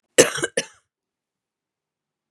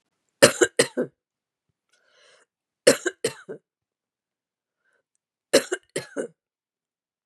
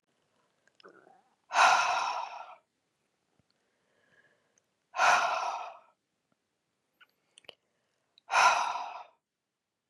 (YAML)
cough_length: 2.3 s
cough_amplitude: 32768
cough_signal_mean_std_ratio: 0.21
three_cough_length: 7.3 s
three_cough_amplitude: 32378
three_cough_signal_mean_std_ratio: 0.21
exhalation_length: 9.9 s
exhalation_amplitude: 10914
exhalation_signal_mean_std_ratio: 0.34
survey_phase: beta (2021-08-13 to 2022-03-07)
age: 45-64
gender: Female
wearing_mask: 'No'
symptom_cough_any: true
symptom_runny_or_blocked_nose: true
symptom_sore_throat: true
symptom_onset: 13 days
smoker_status: Never smoked
respiratory_condition_asthma: false
respiratory_condition_other: false
recruitment_source: REACT
submission_delay: 1 day
covid_test_result: Negative
covid_test_method: RT-qPCR
influenza_a_test_result: Negative
influenza_b_test_result: Negative